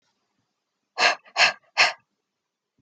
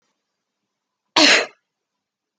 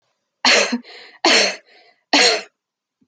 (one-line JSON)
{"exhalation_length": "2.8 s", "exhalation_amplitude": 20944, "exhalation_signal_mean_std_ratio": 0.31, "cough_length": "2.4 s", "cough_amplitude": 32768, "cough_signal_mean_std_ratio": 0.27, "three_cough_length": "3.1 s", "three_cough_amplitude": 29454, "three_cough_signal_mean_std_ratio": 0.45, "survey_phase": "beta (2021-08-13 to 2022-03-07)", "age": "18-44", "gender": "Female", "wearing_mask": "No", "symptom_none": true, "smoker_status": "Never smoked", "respiratory_condition_asthma": false, "respiratory_condition_other": false, "recruitment_source": "Test and Trace", "submission_delay": "2 days", "covid_test_result": "Positive", "covid_test_method": "ePCR"}